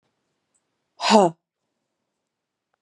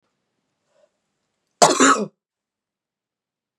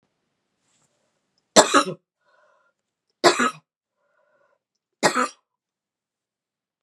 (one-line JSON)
{"exhalation_length": "2.8 s", "exhalation_amplitude": 29726, "exhalation_signal_mean_std_ratio": 0.22, "cough_length": "3.6 s", "cough_amplitude": 32768, "cough_signal_mean_std_ratio": 0.25, "three_cough_length": "6.8 s", "three_cough_amplitude": 32767, "three_cough_signal_mean_std_ratio": 0.23, "survey_phase": "beta (2021-08-13 to 2022-03-07)", "age": "45-64", "gender": "Female", "wearing_mask": "No", "symptom_runny_or_blocked_nose": true, "symptom_fatigue": true, "symptom_headache": true, "symptom_onset": "3 days", "smoker_status": "Never smoked", "respiratory_condition_asthma": false, "respiratory_condition_other": false, "recruitment_source": "Test and Trace", "submission_delay": "1 day", "covid_test_result": "Positive", "covid_test_method": "RT-qPCR", "covid_ct_value": 24.2, "covid_ct_gene": "ORF1ab gene", "covid_ct_mean": 24.4, "covid_viral_load": "9700 copies/ml", "covid_viral_load_category": "Minimal viral load (< 10K copies/ml)"}